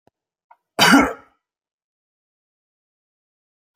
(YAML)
cough_length: 3.8 s
cough_amplitude: 31740
cough_signal_mean_std_ratio: 0.23
survey_phase: alpha (2021-03-01 to 2021-08-12)
age: 45-64
gender: Male
wearing_mask: 'No'
symptom_none: true
smoker_status: Never smoked
respiratory_condition_asthma: false
respiratory_condition_other: false
recruitment_source: REACT
submission_delay: 2 days
covid_test_result: Negative
covid_test_method: RT-qPCR